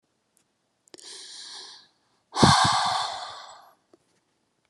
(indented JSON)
{
  "exhalation_length": "4.7 s",
  "exhalation_amplitude": 22020,
  "exhalation_signal_mean_std_ratio": 0.35,
  "survey_phase": "beta (2021-08-13 to 2022-03-07)",
  "age": "18-44",
  "gender": "Female",
  "wearing_mask": "No",
  "symptom_none": true,
  "smoker_status": "Never smoked",
  "respiratory_condition_asthma": false,
  "respiratory_condition_other": false,
  "recruitment_source": "REACT",
  "submission_delay": "3 days",
  "covid_test_result": "Negative",
  "covid_test_method": "RT-qPCR"
}